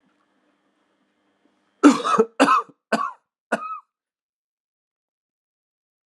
{"cough_length": "6.1 s", "cough_amplitude": 32729, "cough_signal_mean_std_ratio": 0.27, "survey_phase": "alpha (2021-03-01 to 2021-08-12)", "age": "18-44", "gender": "Male", "wearing_mask": "No", "symptom_abdominal_pain": true, "symptom_fatigue": true, "symptom_headache": true, "symptom_change_to_sense_of_smell_or_taste": true, "symptom_loss_of_taste": true, "symptom_onset": "4 days", "smoker_status": "Current smoker (e-cigarettes or vapes only)", "respiratory_condition_asthma": false, "respiratory_condition_other": false, "recruitment_source": "Test and Trace", "submission_delay": "2 days", "covid_test_result": "Positive", "covid_test_method": "RT-qPCR", "covid_ct_value": 17.1, "covid_ct_gene": "N gene", "covid_ct_mean": 17.8, "covid_viral_load": "1400000 copies/ml", "covid_viral_load_category": "High viral load (>1M copies/ml)"}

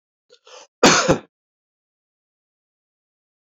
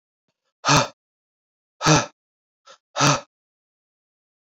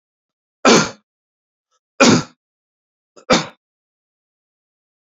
{"cough_length": "3.5 s", "cough_amplitude": 32767, "cough_signal_mean_std_ratio": 0.23, "exhalation_length": "4.5 s", "exhalation_amplitude": 24210, "exhalation_signal_mean_std_ratio": 0.3, "three_cough_length": "5.1 s", "three_cough_amplitude": 32767, "three_cough_signal_mean_std_ratio": 0.27, "survey_phase": "beta (2021-08-13 to 2022-03-07)", "age": "45-64", "gender": "Male", "wearing_mask": "No", "symptom_runny_or_blocked_nose": true, "symptom_fatigue": true, "symptom_headache": true, "symptom_onset": "4 days", "smoker_status": "Never smoked", "respiratory_condition_asthma": false, "respiratory_condition_other": false, "recruitment_source": "Test and Trace", "submission_delay": "2 days", "covid_test_result": "Positive", "covid_test_method": "RT-qPCR", "covid_ct_value": 13.1, "covid_ct_gene": "ORF1ab gene", "covid_ct_mean": 13.8, "covid_viral_load": "29000000 copies/ml", "covid_viral_load_category": "High viral load (>1M copies/ml)"}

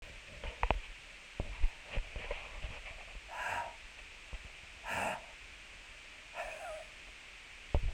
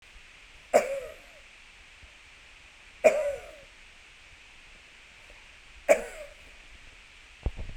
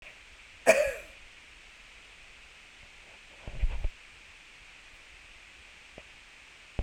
{"exhalation_length": "7.9 s", "exhalation_amplitude": 8124, "exhalation_signal_mean_std_ratio": 0.57, "three_cough_length": "7.8 s", "three_cough_amplitude": 15722, "three_cough_signal_mean_std_ratio": 0.31, "cough_length": "6.8 s", "cough_amplitude": 13689, "cough_signal_mean_std_ratio": 0.32, "survey_phase": "beta (2021-08-13 to 2022-03-07)", "age": "65+", "gender": "Male", "wearing_mask": "No", "symptom_none": true, "smoker_status": "Ex-smoker", "respiratory_condition_asthma": false, "respiratory_condition_other": false, "recruitment_source": "REACT", "submission_delay": "0 days", "covid_test_result": "Negative", "covid_test_method": "RT-qPCR"}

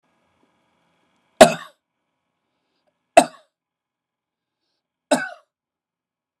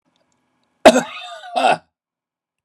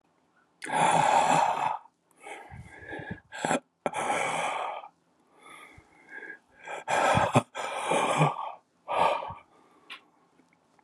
{"three_cough_length": "6.4 s", "three_cough_amplitude": 32768, "three_cough_signal_mean_std_ratio": 0.15, "cough_length": "2.6 s", "cough_amplitude": 32768, "cough_signal_mean_std_ratio": 0.29, "exhalation_length": "10.8 s", "exhalation_amplitude": 12232, "exhalation_signal_mean_std_ratio": 0.53, "survey_phase": "beta (2021-08-13 to 2022-03-07)", "age": "65+", "gender": "Male", "wearing_mask": "No", "symptom_none": true, "smoker_status": "Ex-smoker", "respiratory_condition_asthma": false, "respiratory_condition_other": false, "recruitment_source": "REACT", "submission_delay": "6 days", "covid_test_result": "Negative", "covid_test_method": "RT-qPCR"}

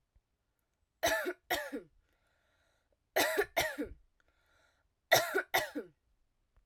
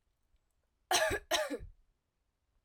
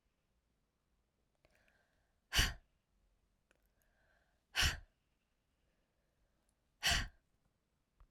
{"three_cough_length": "6.7 s", "three_cough_amplitude": 9132, "three_cough_signal_mean_std_ratio": 0.37, "cough_length": "2.6 s", "cough_amplitude": 5398, "cough_signal_mean_std_ratio": 0.38, "exhalation_length": "8.1 s", "exhalation_amplitude": 4326, "exhalation_signal_mean_std_ratio": 0.22, "survey_phase": "alpha (2021-03-01 to 2021-08-12)", "age": "18-44", "gender": "Female", "wearing_mask": "No", "symptom_fatigue": true, "smoker_status": "Never smoked", "respiratory_condition_asthma": false, "respiratory_condition_other": false, "recruitment_source": "Test and Trace", "submission_delay": "2 days", "covid_test_result": "Positive", "covid_test_method": "RT-qPCR"}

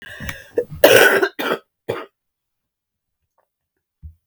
{"cough_length": "4.3 s", "cough_amplitude": 32768, "cough_signal_mean_std_ratio": 0.33, "survey_phase": "beta (2021-08-13 to 2022-03-07)", "age": "45-64", "gender": "Female", "wearing_mask": "No", "symptom_cough_any": true, "symptom_runny_or_blocked_nose": true, "symptom_fatigue": true, "symptom_headache": true, "symptom_onset": "3 days", "smoker_status": "Ex-smoker", "respiratory_condition_asthma": false, "respiratory_condition_other": false, "recruitment_source": "Test and Trace", "submission_delay": "1 day", "covid_test_result": "Positive", "covid_test_method": "RT-qPCR", "covid_ct_value": 19.6, "covid_ct_gene": "ORF1ab gene"}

